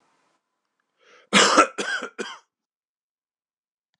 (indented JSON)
{
  "cough_length": "4.0 s",
  "cough_amplitude": 26027,
  "cough_signal_mean_std_ratio": 0.28,
  "survey_phase": "beta (2021-08-13 to 2022-03-07)",
  "age": "45-64",
  "gender": "Male",
  "wearing_mask": "No",
  "symptom_cough_any": true,
  "symptom_runny_or_blocked_nose": true,
  "symptom_fatigue": true,
  "symptom_headache": true,
  "symptom_other": true,
  "symptom_onset": "2 days",
  "smoker_status": "Never smoked",
  "respiratory_condition_asthma": false,
  "respiratory_condition_other": false,
  "recruitment_source": "Test and Trace",
  "submission_delay": "1 day",
  "covid_test_result": "Positive",
  "covid_test_method": "ePCR"
}